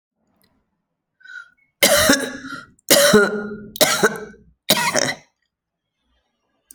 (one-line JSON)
{"cough_length": "6.7 s", "cough_amplitude": 32768, "cough_signal_mean_std_ratio": 0.41, "survey_phase": "alpha (2021-03-01 to 2021-08-12)", "age": "45-64", "gender": "Female", "wearing_mask": "No", "symptom_cough_any": true, "symptom_change_to_sense_of_smell_or_taste": true, "symptom_loss_of_taste": true, "symptom_onset": "5 days", "smoker_status": "Never smoked", "respiratory_condition_asthma": false, "respiratory_condition_other": false, "recruitment_source": "Test and Trace", "submission_delay": "1 day", "covid_test_result": "Positive", "covid_test_method": "RT-qPCR"}